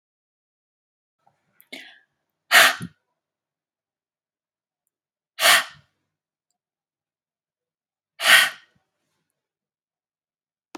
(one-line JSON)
{"exhalation_length": "10.8 s", "exhalation_amplitude": 32768, "exhalation_signal_mean_std_ratio": 0.2, "survey_phase": "beta (2021-08-13 to 2022-03-07)", "age": "45-64", "gender": "Female", "wearing_mask": "No", "symptom_none": true, "smoker_status": "Ex-smoker", "respiratory_condition_asthma": false, "respiratory_condition_other": false, "recruitment_source": "REACT", "submission_delay": "0 days", "covid_test_result": "Negative", "covid_test_method": "RT-qPCR", "influenza_a_test_result": "Negative", "influenza_b_test_result": "Negative"}